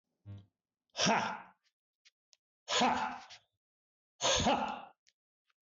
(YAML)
exhalation_length: 5.7 s
exhalation_amplitude: 4635
exhalation_signal_mean_std_ratio: 0.42
survey_phase: beta (2021-08-13 to 2022-03-07)
age: 45-64
gender: Male
wearing_mask: 'No'
symptom_none: true
smoker_status: Never smoked
respiratory_condition_asthma: false
respiratory_condition_other: false
recruitment_source: REACT
submission_delay: 3 days
covid_test_result: Negative
covid_test_method: RT-qPCR
influenza_a_test_result: Negative
influenza_b_test_result: Negative